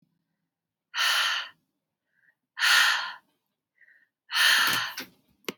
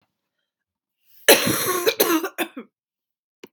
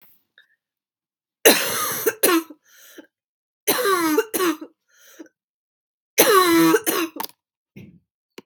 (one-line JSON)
{"exhalation_length": "5.6 s", "exhalation_amplitude": 13459, "exhalation_signal_mean_std_ratio": 0.44, "cough_length": "3.5 s", "cough_amplitude": 32767, "cough_signal_mean_std_ratio": 0.38, "three_cough_length": "8.5 s", "three_cough_amplitude": 32768, "three_cough_signal_mean_std_ratio": 0.44, "survey_phase": "beta (2021-08-13 to 2022-03-07)", "age": "18-44", "gender": "Female", "wearing_mask": "No", "symptom_cough_any": true, "symptom_runny_or_blocked_nose": true, "symptom_sore_throat": true, "symptom_fatigue": true, "symptom_headache": true, "symptom_other": true, "smoker_status": "Never smoked", "respiratory_condition_asthma": false, "respiratory_condition_other": false, "recruitment_source": "Test and Trace", "submission_delay": "2 days", "covid_test_result": "Positive", "covid_test_method": "RT-qPCR", "covid_ct_value": 19.0, "covid_ct_gene": "N gene", "covid_ct_mean": 19.8, "covid_viral_load": "320000 copies/ml", "covid_viral_load_category": "Low viral load (10K-1M copies/ml)"}